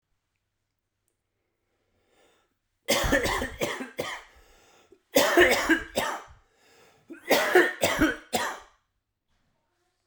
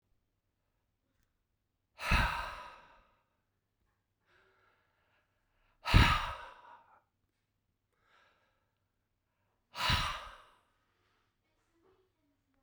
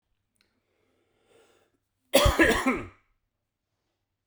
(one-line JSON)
{"three_cough_length": "10.1 s", "three_cough_amplitude": 19039, "three_cough_signal_mean_std_ratio": 0.4, "exhalation_length": "12.6 s", "exhalation_amplitude": 9959, "exhalation_signal_mean_std_ratio": 0.24, "cough_length": "4.3 s", "cough_amplitude": 17280, "cough_signal_mean_std_ratio": 0.3, "survey_phase": "beta (2021-08-13 to 2022-03-07)", "age": "45-64", "gender": "Male", "wearing_mask": "No", "symptom_runny_or_blocked_nose": true, "symptom_fatigue": true, "symptom_fever_high_temperature": true, "symptom_other": true, "symptom_onset": "5 days", "smoker_status": "Never smoked", "respiratory_condition_asthma": true, "respiratory_condition_other": false, "recruitment_source": "Test and Trace", "submission_delay": "2 days", "covid_test_result": "Positive", "covid_test_method": "RT-qPCR", "covid_ct_value": 18.7, "covid_ct_gene": "ORF1ab gene"}